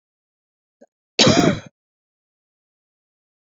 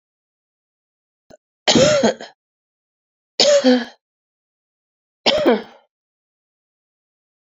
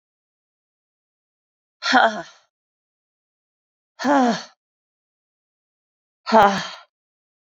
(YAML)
cough_length: 3.5 s
cough_amplitude: 28711
cough_signal_mean_std_ratio: 0.26
three_cough_length: 7.5 s
three_cough_amplitude: 32210
three_cough_signal_mean_std_ratio: 0.33
exhalation_length: 7.6 s
exhalation_amplitude: 29632
exhalation_signal_mean_std_ratio: 0.28
survey_phase: beta (2021-08-13 to 2022-03-07)
age: 45-64
gender: Female
wearing_mask: 'Yes'
symptom_cough_any: true
symptom_runny_or_blocked_nose: true
symptom_fatigue: true
symptom_fever_high_temperature: true
symptom_change_to_sense_of_smell_or_taste: true
symptom_loss_of_taste: true
symptom_onset: 3 days
smoker_status: Never smoked
respiratory_condition_asthma: false
respiratory_condition_other: false
recruitment_source: Test and Trace
submission_delay: 2 days
covid_test_result: Positive
covid_test_method: RT-qPCR
covid_ct_value: 23.1
covid_ct_gene: ORF1ab gene
covid_ct_mean: 23.8
covid_viral_load: 15000 copies/ml
covid_viral_load_category: Low viral load (10K-1M copies/ml)